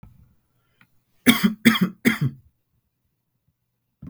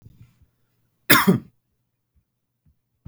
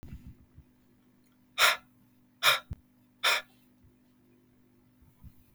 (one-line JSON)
{"three_cough_length": "4.1 s", "three_cough_amplitude": 32768, "three_cough_signal_mean_std_ratio": 0.3, "cough_length": "3.1 s", "cough_amplitude": 32768, "cough_signal_mean_std_ratio": 0.23, "exhalation_length": "5.5 s", "exhalation_amplitude": 15292, "exhalation_signal_mean_std_ratio": 0.27, "survey_phase": "beta (2021-08-13 to 2022-03-07)", "age": "18-44", "gender": "Male", "wearing_mask": "No", "symptom_cough_any": true, "symptom_runny_or_blocked_nose": true, "symptom_sore_throat": true, "symptom_fatigue": true, "symptom_onset": "4 days", "smoker_status": "Never smoked", "respiratory_condition_asthma": false, "respiratory_condition_other": false, "recruitment_source": "Test and Trace", "submission_delay": "2 days", "covid_test_result": "Positive", "covid_test_method": "LFT"}